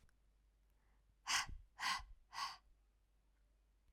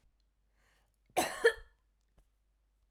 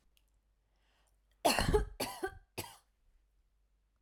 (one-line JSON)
{"exhalation_length": "3.9 s", "exhalation_amplitude": 1614, "exhalation_signal_mean_std_ratio": 0.37, "cough_length": "2.9 s", "cough_amplitude": 6587, "cough_signal_mean_std_ratio": 0.22, "three_cough_length": "4.0 s", "three_cough_amplitude": 5418, "three_cough_signal_mean_std_ratio": 0.32, "survey_phase": "alpha (2021-03-01 to 2021-08-12)", "age": "18-44", "gender": "Female", "wearing_mask": "No", "symptom_none": true, "smoker_status": "Never smoked", "respiratory_condition_asthma": false, "respiratory_condition_other": false, "recruitment_source": "REACT", "submission_delay": "3 days", "covid_test_result": "Negative", "covid_test_method": "RT-qPCR"}